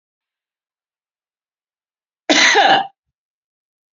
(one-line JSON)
{"cough_length": "3.9 s", "cough_amplitude": 31210, "cough_signal_mean_std_ratio": 0.31, "survey_phase": "beta (2021-08-13 to 2022-03-07)", "age": "45-64", "gender": "Female", "wearing_mask": "No", "symptom_none": true, "smoker_status": "Current smoker (11 or more cigarettes per day)", "respiratory_condition_asthma": true, "respiratory_condition_other": true, "recruitment_source": "REACT", "submission_delay": "12 days", "covid_test_result": "Negative", "covid_test_method": "RT-qPCR"}